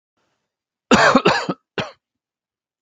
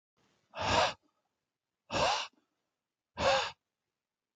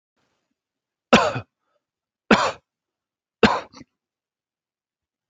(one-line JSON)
{"cough_length": "2.8 s", "cough_amplitude": 29604, "cough_signal_mean_std_ratio": 0.35, "exhalation_length": "4.4 s", "exhalation_amplitude": 7295, "exhalation_signal_mean_std_ratio": 0.38, "three_cough_length": "5.3 s", "three_cough_amplitude": 30870, "three_cough_signal_mean_std_ratio": 0.24, "survey_phase": "alpha (2021-03-01 to 2021-08-12)", "age": "45-64", "gender": "Male", "wearing_mask": "No", "symptom_none": true, "smoker_status": "Never smoked", "respiratory_condition_asthma": false, "respiratory_condition_other": false, "recruitment_source": "REACT", "submission_delay": "1 day", "covid_test_result": "Negative", "covid_test_method": "RT-qPCR"}